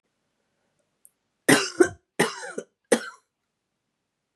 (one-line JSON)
{"three_cough_length": "4.4 s", "three_cough_amplitude": 29078, "three_cough_signal_mean_std_ratio": 0.25, "survey_phase": "beta (2021-08-13 to 2022-03-07)", "age": "45-64", "gender": "Female", "wearing_mask": "No", "symptom_new_continuous_cough": true, "symptom_runny_or_blocked_nose": true, "symptom_other": true, "symptom_onset": "3 days", "smoker_status": "Never smoked", "respiratory_condition_asthma": false, "respiratory_condition_other": false, "recruitment_source": "Test and Trace", "submission_delay": "1 day", "covid_test_result": "Positive", "covid_test_method": "RT-qPCR", "covid_ct_value": 18.5, "covid_ct_gene": "ORF1ab gene", "covid_ct_mean": 18.6, "covid_viral_load": "800000 copies/ml", "covid_viral_load_category": "Low viral load (10K-1M copies/ml)"}